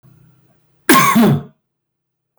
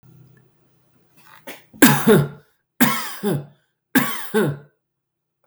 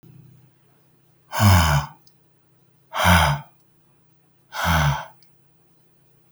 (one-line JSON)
{"cough_length": "2.4 s", "cough_amplitude": 32768, "cough_signal_mean_std_ratio": 0.42, "three_cough_length": "5.5 s", "three_cough_amplitude": 32768, "three_cough_signal_mean_std_ratio": 0.39, "exhalation_length": "6.3 s", "exhalation_amplitude": 25130, "exhalation_signal_mean_std_ratio": 0.4, "survey_phase": "beta (2021-08-13 to 2022-03-07)", "age": "18-44", "gender": "Male", "wearing_mask": "No", "symptom_none": true, "symptom_onset": "9 days", "smoker_status": "Ex-smoker", "respiratory_condition_asthma": false, "respiratory_condition_other": false, "recruitment_source": "REACT", "submission_delay": "2 days", "covid_test_result": "Negative", "covid_test_method": "RT-qPCR", "influenza_a_test_result": "Unknown/Void", "influenza_b_test_result": "Unknown/Void"}